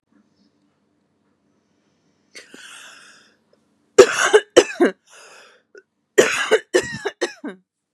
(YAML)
cough_length: 7.9 s
cough_amplitude: 32768
cough_signal_mean_std_ratio: 0.28
survey_phase: beta (2021-08-13 to 2022-03-07)
age: 18-44
gender: Female
wearing_mask: 'No'
symptom_none: true
smoker_status: Ex-smoker
respiratory_condition_asthma: false
respiratory_condition_other: false
recruitment_source: Test and Trace
submission_delay: 2 days
covid_test_result: Positive
covid_test_method: RT-qPCR
covid_ct_value: 35.6
covid_ct_gene: N gene